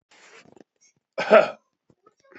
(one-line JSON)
{"cough_length": "2.4 s", "cough_amplitude": 27416, "cough_signal_mean_std_ratio": 0.23, "survey_phase": "beta (2021-08-13 to 2022-03-07)", "age": "18-44", "gender": "Male", "wearing_mask": "No", "symptom_none": true, "smoker_status": "Current smoker (1 to 10 cigarettes per day)", "respiratory_condition_asthma": false, "respiratory_condition_other": false, "recruitment_source": "REACT", "submission_delay": "2 days", "covid_test_result": "Negative", "covid_test_method": "RT-qPCR"}